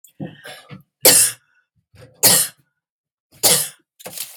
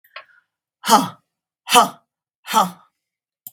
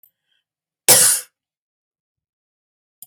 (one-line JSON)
{"three_cough_length": "4.4 s", "three_cough_amplitude": 32768, "three_cough_signal_mean_std_ratio": 0.35, "exhalation_length": "3.5 s", "exhalation_amplitude": 32768, "exhalation_signal_mean_std_ratio": 0.3, "cough_length": "3.1 s", "cough_amplitude": 32768, "cough_signal_mean_std_ratio": 0.25, "survey_phase": "beta (2021-08-13 to 2022-03-07)", "age": "45-64", "gender": "Female", "wearing_mask": "No", "symptom_none": true, "smoker_status": "Ex-smoker", "respiratory_condition_asthma": false, "respiratory_condition_other": false, "recruitment_source": "REACT", "submission_delay": "2 days", "covid_test_result": "Negative", "covid_test_method": "RT-qPCR", "influenza_a_test_result": "Negative", "influenza_b_test_result": "Negative"}